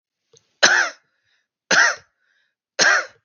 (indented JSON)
{
  "three_cough_length": "3.2 s",
  "three_cough_amplitude": 32768,
  "three_cough_signal_mean_std_ratio": 0.39,
  "survey_phase": "beta (2021-08-13 to 2022-03-07)",
  "age": "18-44",
  "gender": "Male",
  "wearing_mask": "No",
  "symptom_cough_any": true,
  "symptom_sore_throat": true,
  "symptom_onset": "3 days",
  "smoker_status": "Never smoked",
  "respiratory_condition_asthma": false,
  "respiratory_condition_other": false,
  "recruitment_source": "Test and Trace",
  "submission_delay": "0 days",
  "covid_test_result": "Positive",
  "covid_test_method": "RT-qPCR",
  "covid_ct_value": 26.1,
  "covid_ct_gene": "N gene"
}